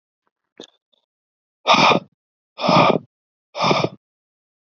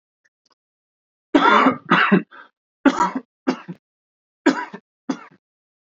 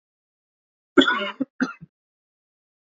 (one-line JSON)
{"exhalation_length": "4.8 s", "exhalation_amplitude": 27955, "exhalation_signal_mean_std_ratio": 0.36, "three_cough_length": "5.8 s", "three_cough_amplitude": 28657, "three_cough_signal_mean_std_ratio": 0.37, "cough_length": "2.8 s", "cough_amplitude": 28250, "cough_signal_mean_std_ratio": 0.26, "survey_phase": "beta (2021-08-13 to 2022-03-07)", "age": "18-44", "gender": "Male", "wearing_mask": "No", "symptom_none": true, "symptom_onset": "9 days", "smoker_status": "Ex-smoker", "respiratory_condition_asthma": false, "respiratory_condition_other": false, "recruitment_source": "REACT", "submission_delay": "1 day", "covid_test_result": "Negative", "covid_test_method": "RT-qPCR", "influenza_a_test_result": "Negative", "influenza_b_test_result": "Negative"}